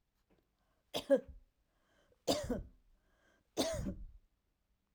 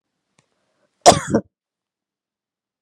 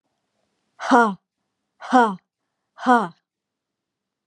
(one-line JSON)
{"three_cough_length": "4.9 s", "three_cough_amplitude": 3994, "three_cough_signal_mean_std_ratio": 0.33, "cough_length": "2.8 s", "cough_amplitude": 32768, "cough_signal_mean_std_ratio": 0.2, "exhalation_length": "4.3 s", "exhalation_amplitude": 27684, "exhalation_signal_mean_std_ratio": 0.3, "survey_phase": "alpha (2021-03-01 to 2021-08-12)", "age": "45-64", "gender": "Female", "wearing_mask": "No", "symptom_none": true, "smoker_status": "Never smoked", "respiratory_condition_asthma": false, "respiratory_condition_other": false, "recruitment_source": "REACT", "submission_delay": "1 day", "covid_test_result": "Negative", "covid_test_method": "RT-qPCR"}